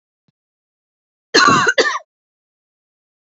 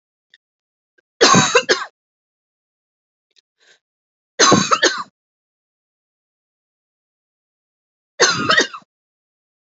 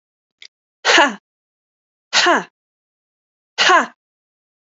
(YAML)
cough_length: 3.3 s
cough_amplitude: 32768
cough_signal_mean_std_ratio: 0.32
three_cough_length: 9.7 s
three_cough_amplitude: 32768
three_cough_signal_mean_std_ratio: 0.3
exhalation_length: 4.8 s
exhalation_amplitude: 32768
exhalation_signal_mean_std_ratio: 0.32
survey_phase: alpha (2021-03-01 to 2021-08-12)
age: 45-64
gender: Female
wearing_mask: 'No'
symptom_none: true
smoker_status: Never smoked
respiratory_condition_asthma: false
respiratory_condition_other: false
recruitment_source: REACT
submission_delay: 1 day
covid_test_result: Negative
covid_test_method: RT-qPCR